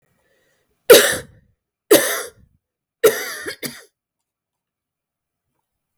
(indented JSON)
{
  "three_cough_length": "6.0 s",
  "three_cough_amplitude": 32768,
  "three_cough_signal_mean_std_ratio": 0.26,
  "survey_phase": "beta (2021-08-13 to 2022-03-07)",
  "age": "45-64",
  "gender": "Female",
  "wearing_mask": "No",
  "symptom_cough_any": true,
  "symptom_runny_or_blocked_nose": true,
  "symptom_shortness_of_breath": true,
  "symptom_fatigue": true,
  "symptom_onset": "11 days",
  "smoker_status": "Never smoked",
  "respiratory_condition_asthma": false,
  "respiratory_condition_other": false,
  "recruitment_source": "REACT",
  "submission_delay": "3 days",
  "covid_test_result": "Negative",
  "covid_test_method": "RT-qPCR",
  "influenza_a_test_result": "Unknown/Void",
  "influenza_b_test_result": "Unknown/Void"
}